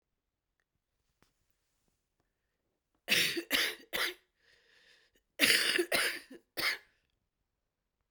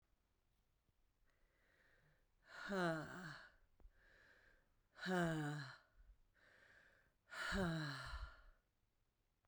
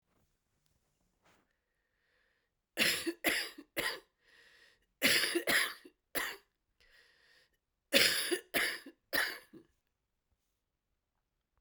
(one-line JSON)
{"cough_length": "8.1 s", "cough_amplitude": 12481, "cough_signal_mean_std_ratio": 0.35, "exhalation_length": "9.5 s", "exhalation_amplitude": 1002, "exhalation_signal_mean_std_ratio": 0.44, "three_cough_length": "11.6 s", "three_cough_amplitude": 10403, "three_cough_signal_mean_std_ratio": 0.36, "survey_phase": "beta (2021-08-13 to 2022-03-07)", "age": "45-64", "gender": "Female", "wearing_mask": "No", "symptom_cough_any": true, "symptom_new_continuous_cough": true, "symptom_runny_or_blocked_nose": true, "symptom_shortness_of_breath": true, "symptom_abdominal_pain": true, "symptom_diarrhoea": true, "symptom_fatigue": true, "symptom_fever_high_temperature": true, "symptom_headache": true, "symptom_onset": "4 days", "smoker_status": "Ex-smoker", "respiratory_condition_asthma": false, "respiratory_condition_other": true, "recruitment_source": "Test and Trace", "submission_delay": "1 day", "covid_test_result": "Positive", "covid_test_method": "RT-qPCR", "covid_ct_value": 15.9, "covid_ct_gene": "ORF1ab gene", "covid_ct_mean": 16.5, "covid_viral_load": "4000000 copies/ml", "covid_viral_load_category": "High viral load (>1M copies/ml)"}